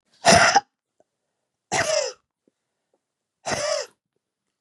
{"exhalation_length": "4.6 s", "exhalation_amplitude": 26878, "exhalation_signal_mean_std_ratio": 0.35, "survey_phase": "beta (2021-08-13 to 2022-03-07)", "age": "45-64", "gender": "Female", "wearing_mask": "No", "symptom_cough_any": true, "symptom_runny_or_blocked_nose": true, "symptom_sore_throat": true, "symptom_abdominal_pain": true, "symptom_fatigue": true, "symptom_headache": true, "smoker_status": "Never smoked", "respiratory_condition_asthma": false, "respiratory_condition_other": false, "recruitment_source": "Test and Trace", "submission_delay": "2 days", "covid_test_result": "Positive", "covid_test_method": "RT-qPCR", "covid_ct_value": 28.6, "covid_ct_gene": "ORF1ab gene"}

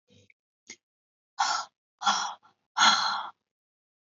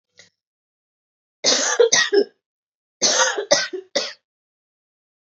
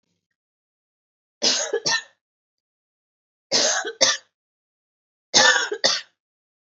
{"exhalation_length": "4.1 s", "exhalation_amplitude": 16003, "exhalation_signal_mean_std_ratio": 0.37, "cough_length": "5.3 s", "cough_amplitude": 28655, "cough_signal_mean_std_ratio": 0.41, "three_cough_length": "6.7 s", "three_cough_amplitude": 30743, "three_cough_signal_mean_std_ratio": 0.37, "survey_phase": "alpha (2021-03-01 to 2021-08-12)", "age": "18-44", "gender": "Female", "wearing_mask": "No", "symptom_cough_any": true, "symptom_change_to_sense_of_smell_or_taste": true, "symptom_loss_of_taste": true, "symptom_onset": "6 days", "smoker_status": "Never smoked", "respiratory_condition_asthma": false, "respiratory_condition_other": false, "recruitment_source": "Test and Trace", "submission_delay": "3 days", "covid_test_result": "Positive", "covid_test_method": "RT-qPCR"}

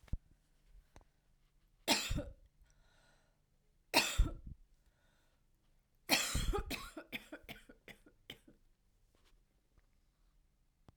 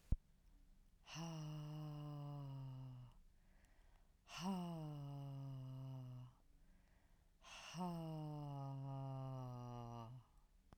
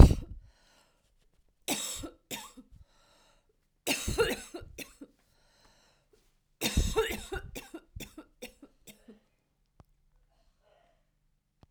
{"three_cough_length": "11.0 s", "three_cough_amplitude": 6686, "three_cough_signal_mean_std_ratio": 0.3, "exhalation_length": "10.8 s", "exhalation_amplitude": 2060, "exhalation_signal_mean_std_ratio": 0.84, "cough_length": "11.7 s", "cough_amplitude": 25350, "cough_signal_mean_std_ratio": 0.22, "survey_phase": "alpha (2021-03-01 to 2021-08-12)", "age": "45-64", "gender": "Female", "wearing_mask": "No", "symptom_cough_any": true, "symptom_new_continuous_cough": true, "symptom_fatigue": true, "symptom_onset": "5 days", "smoker_status": "Never smoked", "respiratory_condition_asthma": false, "respiratory_condition_other": false, "recruitment_source": "Test and Trace", "submission_delay": "1 day", "covid_test_result": "Positive", "covid_test_method": "RT-qPCR"}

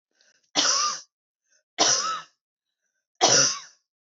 {"three_cough_length": "4.2 s", "three_cough_amplitude": 18251, "three_cough_signal_mean_std_ratio": 0.42, "survey_phase": "beta (2021-08-13 to 2022-03-07)", "age": "18-44", "gender": "Female", "wearing_mask": "No", "symptom_cough_any": true, "symptom_new_continuous_cough": true, "symptom_runny_or_blocked_nose": true, "symptom_sore_throat": true, "symptom_fatigue": true, "symptom_onset": "2 days", "smoker_status": "Never smoked", "respiratory_condition_asthma": false, "respiratory_condition_other": false, "recruitment_source": "Test and Trace", "submission_delay": "2 days", "covid_test_result": "Positive", "covid_test_method": "RT-qPCR", "covid_ct_value": 27.0, "covid_ct_gene": "ORF1ab gene", "covid_ct_mean": 27.3, "covid_viral_load": "1100 copies/ml", "covid_viral_load_category": "Minimal viral load (< 10K copies/ml)"}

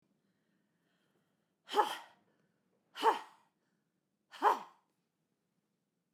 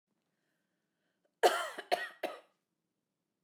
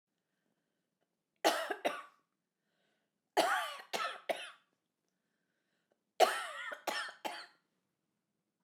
{"exhalation_length": "6.1 s", "exhalation_amplitude": 5660, "exhalation_signal_mean_std_ratio": 0.23, "cough_length": "3.4 s", "cough_amplitude": 7888, "cough_signal_mean_std_ratio": 0.26, "three_cough_length": "8.6 s", "three_cough_amplitude": 7675, "three_cough_signal_mean_std_ratio": 0.33, "survey_phase": "beta (2021-08-13 to 2022-03-07)", "age": "45-64", "gender": "Female", "wearing_mask": "No", "symptom_none": true, "symptom_onset": "11 days", "smoker_status": "Never smoked", "respiratory_condition_asthma": false, "respiratory_condition_other": false, "recruitment_source": "REACT", "submission_delay": "3 days", "covid_test_result": "Negative", "covid_test_method": "RT-qPCR", "influenza_a_test_result": "Negative", "influenza_b_test_result": "Negative"}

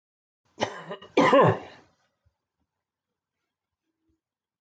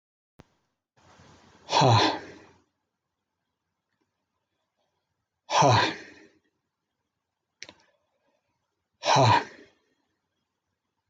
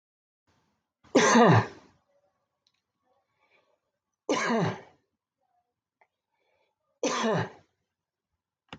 {"cough_length": "4.6 s", "cough_amplitude": 13645, "cough_signal_mean_std_ratio": 0.27, "exhalation_length": "11.1 s", "exhalation_amplitude": 12852, "exhalation_signal_mean_std_ratio": 0.28, "three_cough_length": "8.8 s", "three_cough_amplitude": 13139, "three_cough_signal_mean_std_ratio": 0.3, "survey_phase": "beta (2021-08-13 to 2022-03-07)", "age": "45-64", "gender": "Male", "wearing_mask": "No", "symptom_none": true, "symptom_onset": "13 days", "smoker_status": "Ex-smoker", "respiratory_condition_asthma": false, "respiratory_condition_other": false, "recruitment_source": "REACT", "submission_delay": "1 day", "covid_test_result": "Negative", "covid_test_method": "RT-qPCR"}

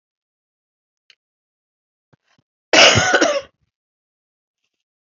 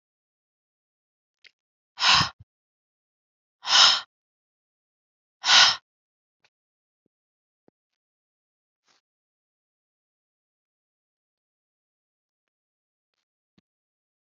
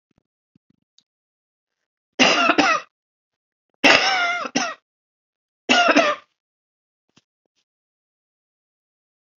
{"cough_length": "5.1 s", "cough_amplitude": 31053, "cough_signal_mean_std_ratio": 0.27, "exhalation_length": "14.3 s", "exhalation_amplitude": 25024, "exhalation_signal_mean_std_ratio": 0.19, "three_cough_length": "9.4 s", "three_cough_amplitude": 29276, "three_cough_signal_mean_std_ratio": 0.33, "survey_phase": "beta (2021-08-13 to 2022-03-07)", "age": "45-64", "gender": "Female", "wearing_mask": "No", "symptom_cough_any": true, "symptom_runny_or_blocked_nose": true, "symptom_fatigue": true, "symptom_change_to_sense_of_smell_or_taste": true, "symptom_other": true, "symptom_onset": "4 days", "smoker_status": "Never smoked", "respiratory_condition_asthma": false, "respiratory_condition_other": false, "recruitment_source": "Test and Trace", "submission_delay": "1 day", "covid_test_result": "Positive", "covid_test_method": "ePCR"}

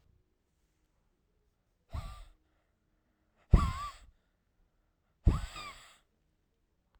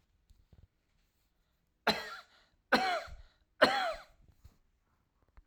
{"exhalation_length": "7.0 s", "exhalation_amplitude": 12693, "exhalation_signal_mean_std_ratio": 0.2, "three_cough_length": "5.5 s", "three_cough_amplitude": 12490, "three_cough_signal_mean_std_ratio": 0.3, "survey_phase": "alpha (2021-03-01 to 2021-08-12)", "age": "18-44", "gender": "Male", "wearing_mask": "No", "symptom_shortness_of_breath": true, "symptom_fatigue": true, "symptom_onset": "13 days", "smoker_status": "Never smoked", "respiratory_condition_asthma": false, "respiratory_condition_other": false, "recruitment_source": "REACT", "submission_delay": "11 days", "covid_test_result": "Negative", "covid_test_method": "RT-qPCR"}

